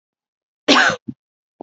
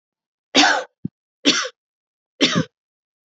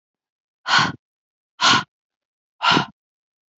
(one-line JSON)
{"cough_length": "1.6 s", "cough_amplitude": 32768, "cough_signal_mean_std_ratio": 0.33, "three_cough_length": "3.3 s", "three_cough_amplitude": 28649, "three_cough_signal_mean_std_ratio": 0.35, "exhalation_length": "3.6 s", "exhalation_amplitude": 24168, "exhalation_signal_mean_std_ratio": 0.34, "survey_phase": "alpha (2021-03-01 to 2021-08-12)", "age": "18-44", "gender": "Female", "wearing_mask": "No", "symptom_none": true, "smoker_status": "Ex-smoker", "respiratory_condition_asthma": false, "respiratory_condition_other": false, "recruitment_source": "REACT", "submission_delay": "1 day", "covid_test_result": "Negative", "covid_test_method": "RT-qPCR"}